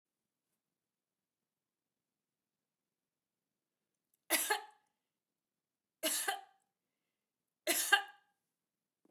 {"three_cough_length": "9.1 s", "three_cough_amplitude": 8509, "three_cough_signal_mean_std_ratio": 0.23, "survey_phase": "beta (2021-08-13 to 2022-03-07)", "age": "45-64", "gender": "Female", "wearing_mask": "No", "symptom_none": true, "smoker_status": "Never smoked", "respiratory_condition_asthma": false, "respiratory_condition_other": false, "recruitment_source": "REACT", "submission_delay": "1 day", "covid_test_result": "Negative", "covid_test_method": "RT-qPCR"}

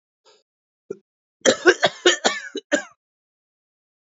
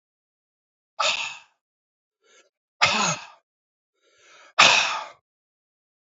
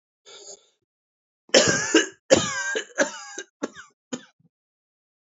{"cough_length": "4.2 s", "cough_amplitude": 27198, "cough_signal_mean_std_ratio": 0.29, "exhalation_length": "6.1 s", "exhalation_amplitude": 32767, "exhalation_signal_mean_std_ratio": 0.3, "three_cough_length": "5.3 s", "three_cough_amplitude": 26469, "three_cough_signal_mean_std_ratio": 0.34, "survey_phase": "beta (2021-08-13 to 2022-03-07)", "age": "45-64", "gender": "Male", "wearing_mask": "No", "symptom_cough_any": true, "symptom_runny_or_blocked_nose": true, "symptom_fatigue": true, "symptom_headache": true, "symptom_onset": "3 days", "smoker_status": "Never smoked", "respiratory_condition_asthma": false, "respiratory_condition_other": false, "recruitment_source": "Test and Trace", "submission_delay": "1 day", "covid_test_result": "Positive", "covid_test_method": "RT-qPCR", "covid_ct_value": 14.2, "covid_ct_gene": "ORF1ab gene", "covid_ct_mean": 14.3, "covid_viral_load": "21000000 copies/ml", "covid_viral_load_category": "High viral load (>1M copies/ml)"}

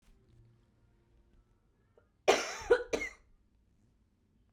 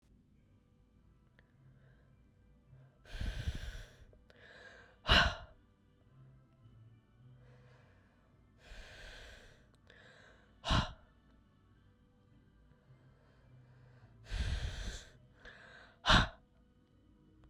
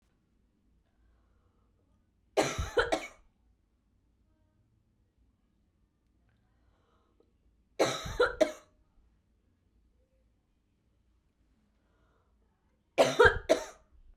{"cough_length": "4.5 s", "cough_amplitude": 8656, "cough_signal_mean_std_ratio": 0.25, "exhalation_length": "17.5 s", "exhalation_amplitude": 7461, "exhalation_signal_mean_std_ratio": 0.28, "three_cough_length": "14.2 s", "three_cough_amplitude": 12499, "three_cough_signal_mean_std_ratio": 0.23, "survey_phase": "beta (2021-08-13 to 2022-03-07)", "age": "18-44", "gender": "Female", "wearing_mask": "No", "symptom_cough_any": true, "smoker_status": "Never smoked", "respiratory_condition_asthma": false, "respiratory_condition_other": false, "recruitment_source": "Test and Trace", "submission_delay": "2 days", "covid_test_result": "Positive", "covid_test_method": "ePCR"}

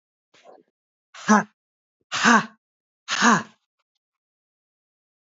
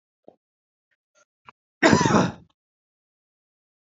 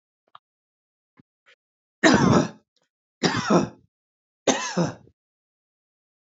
{"exhalation_length": "5.2 s", "exhalation_amplitude": 26069, "exhalation_signal_mean_std_ratio": 0.28, "cough_length": "3.9 s", "cough_amplitude": 26442, "cough_signal_mean_std_ratio": 0.27, "three_cough_length": "6.4 s", "three_cough_amplitude": 26485, "three_cough_signal_mean_std_ratio": 0.33, "survey_phase": "beta (2021-08-13 to 2022-03-07)", "age": "45-64", "gender": "Male", "wearing_mask": "No", "symptom_none": true, "smoker_status": "Never smoked", "respiratory_condition_asthma": true, "respiratory_condition_other": false, "recruitment_source": "REACT", "submission_delay": "2 days", "covid_test_result": "Negative", "covid_test_method": "RT-qPCR"}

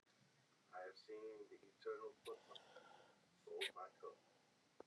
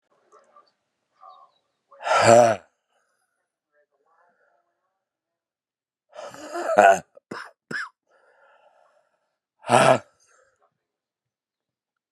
{"three_cough_length": "4.9 s", "three_cough_amplitude": 802, "three_cough_signal_mean_std_ratio": 0.56, "exhalation_length": "12.1 s", "exhalation_amplitude": 31957, "exhalation_signal_mean_std_ratio": 0.25, "survey_phase": "beta (2021-08-13 to 2022-03-07)", "age": "18-44", "gender": "Male", "wearing_mask": "No", "symptom_cough_any": true, "symptom_runny_or_blocked_nose": true, "symptom_shortness_of_breath": true, "symptom_sore_throat": true, "symptom_abdominal_pain": true, "symptom_fatigue": true, "symptom_headache": true, "symptom_change_to_sense_of_smell_or_taste": true, "symptom_loss_of_taste": true, "symptom_onset": "2 days", "smoker_status": "Never smoked", "respiratory_condition_asthma": false, "respiratory_condition_other": false, "recruitment_source": "Test and Trace", "submission_delay": "1 day", "covid_test_result": "Positive", "covid_test_method": "RT-qPCR", "covid_ct_value": 20.4, "covid_ct_gene": "ORF1ab gene", "covid_ct_mean": 20.6, "covid_viral_load": "170000 copies/ml", "covid_viral_load_category": "Low viral load (10K-1M copies/ml)"}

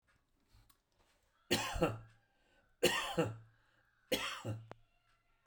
{"three_cough_length": "5.5 s", "three_cough_amplitude": 4452, "three_cough_signal_mean_std_ratio": 0.38, "survey_phase": "beta (2021-08-13 to 2022-03-07)", "age": "45-64", "gender": "Male", "wearing_mask": "No", "symptom_none": true, "smoker_status": "Never smoked", "respiratory_condition_asthma": false, "respiratory_condition_other": false, "recruitment_source": "REACT", "submission_delay": "5 days", "covid_test_result": "Negative", "covid_test_method": "RT-qPCR"}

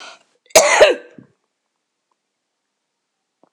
{"cough_length": "3.5 s", "cough_amplitude": 26028, "cough_signal_mean_std_ratio": 0.27, "survey_phase": "alpha (2021-03-01 to 2021-08-12)", "age": "65+", "gender": "Female", "wearing_mask": "No", "symptom_none": true, "smoker_status": "Ex-smoker", "respiratory_condition_asthma": false, "respiratory_condition_other": false, "recruitment_source": "REACT", "submission_delay": "2 days", "covid_test_result": "Negative", "covid_test_method": "RT-qPCR"}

